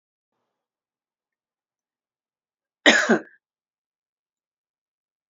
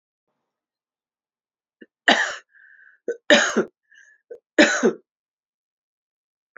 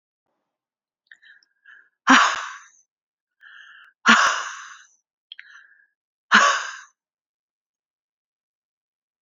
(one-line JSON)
{"cough_length": "5.3 s", "cough_amplitude": 29913, "cough_signal_mean_std_ratio": 0.18, "three_cough_length": "6.6 s", "three_cough_amplitude": 29529, "three_cough_signal_mean_std_ratio": 0.27, "exhalation_length": "9.2 s", "exhalation_amplitude": 28693, "exhalation_signal_mean_std_ratio": 0.26, "survey_phase": "beta (2021-08-13 to 2022-03-07)", "age": "45-64", "gender": "Female", "wearing_mask": "No", "symptom_none": true, "smoker_status": "Ex-smoker", "respiratory_condition_asthma": false, "respiratory_condition_other": false, "recruitment_source": "REACT", "submission_delay": "0 days", "covid_test_result": "Negative", "covid_test_method": "RT-qPCR"}